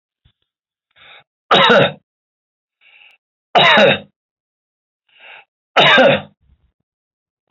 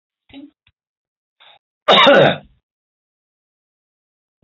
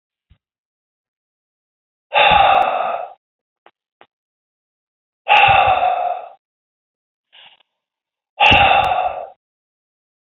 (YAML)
three_cough_length: 7.5 s
three_cough_amplitude: 31363
three_cough_signal_mean_std_ratio: 0.35
cough_length: 4.4 s
cough_amplitude: 28934
cough_signal_mean_std_ratio: 0.28
exhalation_length: 10.3 s
exhalation_amplitude: 31146
exhalation_signal_mean_std_ratio: 0.4
survey_phase: alpha (2021-03-01 to 2021-08-12)
age: 65+
gender: Male
wearing_mask: 'No'
symptom_none: true
smoker_status: Never smoked
respiratory_condition_asthma: false
respiratory_condition_other: false
recruitment_source: REACT
submission_delay: 1 day
covid_test_result: Negative
covid_test_method: RT-qPCR